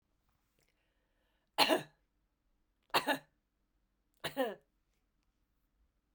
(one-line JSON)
{"three_cough_length": "6.1 s", "three_cough_amplitude": 7762, "three_cough_signal_mean_std_ratio": 0.24, "survey_phase": "beta (2021-08-13 to 2022-03-07)", "age": "45-64", "gender": "Female", "wearing_mask": "No", "symptom_cough_any": true, "symptom_runny_or_blocked_nose": true, "symptom_headache": true, "symptom_change_to_sense_of_smell_or_taste": true, "symptom_loss_of_taste": true, "symptom_onset": "3 days", "smoker_status": "Ex-smoker", "respiratory_condition_asthma": false, "respiratory_condition_other": false, "recruitment_source": "Test and Trace", "submission_delay": "2 days", "covid_test_result": "Positive", "covid_test_method": "RT-qPCR", "covid_ct_value": 24.8, "covid_ct_gene": "ORF1ab gene"}